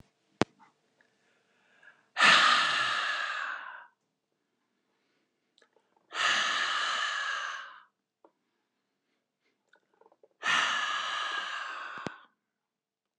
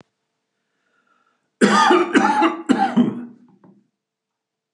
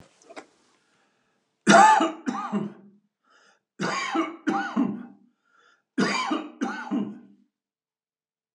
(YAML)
exhalation_length: 13.2 s
exhalation_amplitude: 12964
exhalation_signal_mean_std_ratio: 0.43
cough_length: 4.7 s
cough_amplitude: 31378
cough_signal_mean_std_ratio: 0.45
three_cough_length: 8.5 s
three_cough_amplitude: 23202
three_cough_signal_mean_std_ratio: 0.39
survey_phase: alpha (2021-03-01 to 2021-08-12)
age: 65+
gender: Male
wearing_mask: 'No'
symptom_none: true
smoker_status: Prefer not to say
respiratory_condition_asthma: true
respiratory_condition_other: false
recruitment_source: REACT
submission_delay: 1 day
covid_test_result: Negative
covid_test_method: RT-qPCR